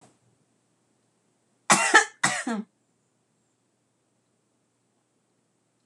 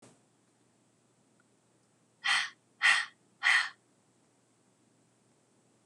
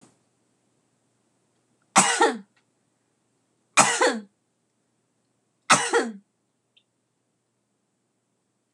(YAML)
cough_length: 5.9 s
cough_amplitude: 26027
cough_signal_mean_std_ratio: 0.23
exhalation_length: 5.9 s
exhalation_amplitude: 8339
exhalation_signal_mean_std_ratio: 0.28
three_cough_length: 8.7 s
three_cough_amplitude: 26027
three_cough_signal_mean_std_ratio: 0.26
survey_phase: beta (2021-08-13 to 2022-03-07)
age: 18-44
gender: Female
wearing_mask: 'No'
symptom_cough_any: true
symptom_fatigue: true
symptom_other: true
smoker_status: Never smoked
respiratory_condition_asthma: false
respiratory_condition_other: false
recruitment_source: Test and Trace
submission_delay: 1 day
covid_test_result: Positive
covid_test_method: RT-qPCR